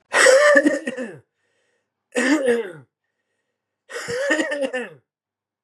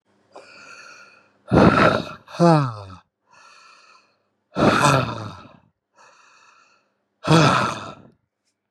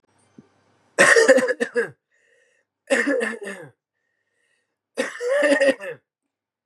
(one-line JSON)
{"three_cough_length": "5.6 s", "three_cough_amplitude": 29917, "three_cough_signal_mean_std_ratio": 0.48, "exhalation_length": "8.7 s", "exhalation_amplitude": 30402, "exhalation_signal_mean_std_ratio": 0.4, "cough_length": "6.7 s", "cough_amplitude": 30077, "cough_signal_mean_std_ratio": 0.42, "survey_phase": "beta (2021-08-13 to 2022-03-07)", "age": "18-44", "gender": "Male", "wearing_mask": "No", "symptom_cough_any": true, "symptom_runny_or_blocked_nose": true, "symptom_shortness_of_breath": true, "symptom_sore_throat": true, "symptom_abdominal_pain": true, "symptom_fatigue": true, "symptom_headache": true, "symptom_loss_of_taste": true, "symptom_onset": "2 days", "smoker_status": "Ex-smoker", "respiratory_condition_asthma": true, "respiratory_condition_other": false, "recruitment_source": "Test and Trace", "submission_delay": "2 days", "covid_test_result": "Positive", "covid_test_method": "RT-qPCR", "covid_ct_value": 19.7, "covid_ct_gene": "ORF1ab gene", "covid_ct_mean": 20.3, "covid_viral_load": "220000 copies/ml", "covid_viral_load_category": "Low viral load (10K-1M copies/ml)"}